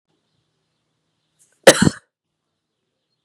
{"cough_length": "3.2 s", "cough_amplitude": 32768, "cough_signal_mean_std_ratio": 0.16, "survey_phase": "beta (2021-08-13 to 2022-03-07)", "age": "18-44", "gender": "Female", "wearing_mask": "No", "symptom_runny_or_blocked_nose": true, "symptom_sore_throat": true, "symptom_fever_high_temperature": true, "symptom_headache": true, "symptom_onset": "1 day", "smoker_status": "Never smoked", "respiratory_condition_asthma": false, "respiratory_condition_other": false, "recruitment_source": "Test and Trace", "submission_delay": "1 day", "covid_test_result": "Positive", "covid_test_method": "RT-qPCR", "covid_ct_value": 18.0, "covid_ct_gene": "N gene", "covid_ct_mean": 18.1, "covid_viral_load": "1100000 copies/ml", "covid_viral_load_category": "High viral load (>1M copies/ml)"}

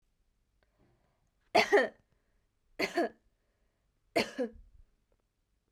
{"three_cough_length": "5.7 s", "three_cough_amplitude": 9036, "three_cough_signal_mean_std_ratio": 0.27, "survey_phase": "beta (2021-08-13 to 2022-03-07)", "age": "18-44", "gender": "Female", "wearing_mask": "No", "symptom_diarrhoea": true, "symptom_fatigue": true, "symptom_headache": true, "symptom_onset": "3 days", "smoker_status": "Never smoked", "respiratory_condition_asthma": false, "respiratory_condition_other": false, "recruitment_source": "Test and Trace", "submission_delay": "1 day", "covid_test_result": "Positive", "covid_test_method": "RT-qPCR", "covid_ct_value": 17.4, "covid_ct_gene": "ORF1ab gene"}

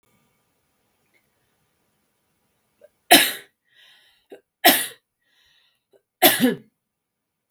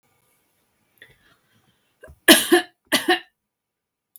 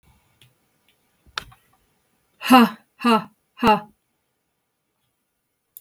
{"three_cough_length": "7.5 s", "three_cough_amplitude": 32768, "three_cough_signal_mean_std_ratio": 0.23, "cough_length": "4.2 s", "cough_amplitude": 32768, "cough_signal_mean_std_ratio": 0.25, "exhalation_length": "5.8 s", "exhalation_amplitude": 32768, "exhalation_signal_mean_std_ratio": 0.25, "survey_phase": "beta (2021-08-13 to 2022-03-07)", "age": "45-64", "gender": "Female", "wearing_mask": "No", "symptom_headache": true, "smoker_status": "Never smoked", "respiratory_condition_asthma": false, "respiratory_condition_other": false, "recruitment_source": "REACT", "submission_delay": "2 days", "covid_test_result": "Negative", "covid_test_method": "RT-qPCR"}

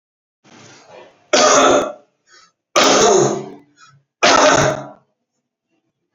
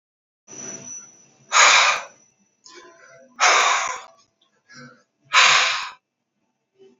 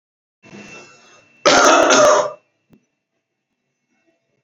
{"three_cough_length": "6.1 s", "three_cough_amplitude": 32767, "three_cough_signal_mean_std_ratio": 0.47, "exhalation_length": "7.0 s", "exhalation_amplitude": 27124, "exhalation_signal_mean_std_ratio": 0.4, "cough_length": "4.4 s", "cough_amplitude": 32768, "cough_signal_mean_std_ratio": 0.38, "survey_phase": "alpha (2021-03-01 to 2021-08-12)", "age": "18-44", "gender": "Male", "wearing_mask": "No", "symptom_none": true, "smoker_status": "Current smoker (1 to 10 cigarettes per day)", "respiratory_condition_asthma": false, "respiratory_condition_other": false, "recruitment_source": "REACT", "submission_delay": "3 days", "covid_test_result": "Negative", "covid_test_method": "RT-qPCR"}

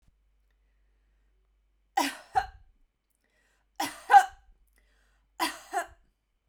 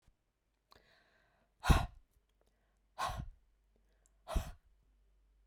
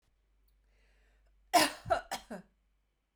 {"three_cough_length": "6.5 s", "three_cough_amplitude": 18275, "three_cough_signal_mean_std_ratio": 0.22, "exhalation_length": "5.5 s", "exhalation_amplitude": 7394, "exhalation_signal_mean_std_ratio": 0.23, "cough_length": "3.2 s", "cough_amplitude": 7899, "cough_signal_mean_std_ratio": 0.27, "survey_phase": "beta (2021-08-13 to 2022-03-07)", "age": "45-64", "gender": "Female", "wearing_mask": "No", "symptom_none": true, "smoker_status": "Never smoked", "respiratory_condition_asthma": false, "respiratory_condition_other": false, "recruitment_source": "REACT", "submission_delay": "1 day", "covid_test_result": "Negative", "covid_test_method": "RT-qPCR"}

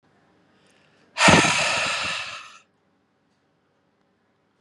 {"exhalation_length": "4.6 s", "exhalation_amplitude": 31743, "exhalation_signal_mean_std_ratio": 0.35, "survey_phase": "beta (2021-08-13 to 2022-03-07)", "age": "45-64", "gender": "Male", "wearing_mask": "No", "symptom_cough_any": true, "symptom_runny_or_blocked_nose": true, "symptom_shortness_of_breath": true, "symptom_fatigue": true, "smoker_status": "Ex-smoker", "respiratory_condition_asthma": false, "respiratory_condition_other": false, "recruitment_source": "Test and Trace", "submission_delay": "2 days", "covid_test_result": "Positive", "covid_test_method": "RT-qPCR", "covid_ct_value": 18.6, "covid_ct_gene": "ORF1ab gene"}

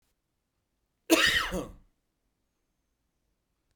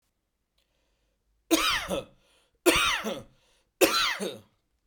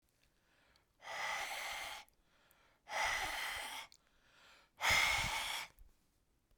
{"cough_length": "3.8 s", "cough_amplitude": 13757, "cough_signal_mean_std_ratio": 0.28, "three_cough_length": "4.9 s", "three_cough_amplitude": 16135, "three_cough_signal_mean_std_ratio": 0.42, "exhalation_length": "6.6 s", "exhalation_amplitude": 3198, "exhalation_signal_mean_std_ratio": 0.51, "survey_phase": "beta (2021-08-13 to 2022-03-07)", "age": "18-44", "gender": "Male", "wearing_mask": "No", "symptom_none": true, "smoker_status": "Ex-smoker", "respiratory_condition_asthma": false, "respiratory_condition_other": false, "recruitment_source": "REACT", "submission_delay": "5 days", "covid_test_result": "Negative", "covid_test_method": "RT-qPCR"}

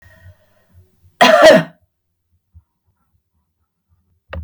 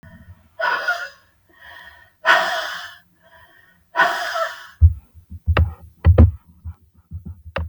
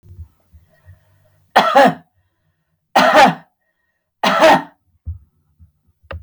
{"cough_length": "4.4 s", "cough_amplitude": 32768, "cough_signal_mean_std_ratio": 0.28, "exhalation_length": "7.7 s", "exhalation_amplitude": 32768, "exhalation_signal_mean_std_ratio": 0.4, "three_cough_length": "6.2 s", "three_cough_amplitude": 32768, "three_cough_signal_mean_std_ratio": 0.37, "survey_phase": "beta (2021-08-13 to 2022-03-07)", "age": "45-64", "gender": "Female", "wearing_mask": "No", "symptom_none": true, "smoker_status": "Never smoked", "respiratory_condition_asthma": false, "respiratory_condition_other": false, "recruitment_source": "REACT", "submission_delay": "2 days", "covid_test_result": "Negative", "covid_test_method": "RT-qPCR", "influenza_a_test_result": "Negative", "influenza_b_test_result": "Negative"}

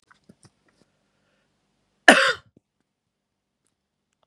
{"cough_length": "4.3 s", "cough_amplitude": 32768, "cough_signal_mean_std_ratio": 0.17, "survey_phase": "beta (2021-08-13 to 2022-03-07)", "age": "18-44", "gender": "Male", "wearing_mask": "No", "symptom_none": true, "smoker_status": "Never smoked", "respiratory_condition_asthma": false, "respiratory_condition_other": false, "recruitment_source": "REACT", "submission_delay": "2 days", "covid_test_result": "Negative", "covid_test_method": "RT-qPCR", "influenza_a_test_result": "Negative", "influenza_b_test_result": "Negative"}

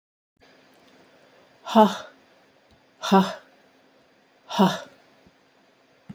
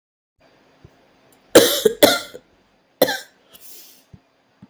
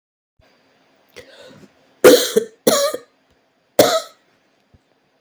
{"exhalation_length": "6.1 s", "exhalation_amplitude": 26397, "exhalation_signal_mean_std_ratio": 0.26, "cough_length": "4.7 s", "cough_amplitude": 32768, "cough_signal_mean_std_ratio": 0.27, "three_cough_length": "5.2 s", "three_cough_amplitude": 32768, "three_cough_signal_mean_std_ratio": 0.3, "survey_phase": "beta (2021-08-13 to 2022-03-07)", "age": "45-64", "gender": "Female", "wearing_mask": "No", "symptom_cough_any": true, "symptom_runny_or_blocked_nose": true, "symptom_shortness_of_breath": true, "symptom_sore_throat": true, "symptom_fatigue": true, "symptom_headache": true, "symptom_change_to_sense_of_smell_or_taste": true, "symptom_loss_of_taste": true, "symptom_onset": "2 days", "smoker_status": "Ex-smoker", "respiratory_condition_asthma": false, "respiratory_condition_other": false, "recruitment_source": "Test and Trace", "submission_delay": "1 day", "covid_test_result": "Positive", "covid_test_method": "RT-qPCR", "covid_ct_value": 20.3, "covid_ct_gene": "ORF1ab gene"}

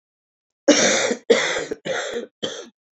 {"three_cough_length": "3.0 s", "three_cough_amplitude": 27336, "three_cough_signal_mean_std_ratio": 0.5, "survey_phase": "alpha (2021-03-01 to 2021-08-12)", "age": "45-64", "gender": "Female", "wearing_mask": "No", "symptom_cough_any": true, "symptom_shortness_of_breath": true, "symptom_fatigue": true, "symptom_headache": true, "symptom_onset": "3 days", "smoker_status": "Ex-smoker", "respiratory_condition_asthma": true, "respiratory_condition_other": false, "recruitment_source": "Test and Trace", "submission_delay": "1 day", "covid_test_result": "Positive", "covid_test_method": "RT-qPCR", "covid_ct_value": 11.9, "covid_ct_gene": "S gene", "covid_ct_mean": 12.1, "covid_viral_load": "110000000 copies/ml", "covid_viral_load_category": "High viral load (>1M copies/ml)"}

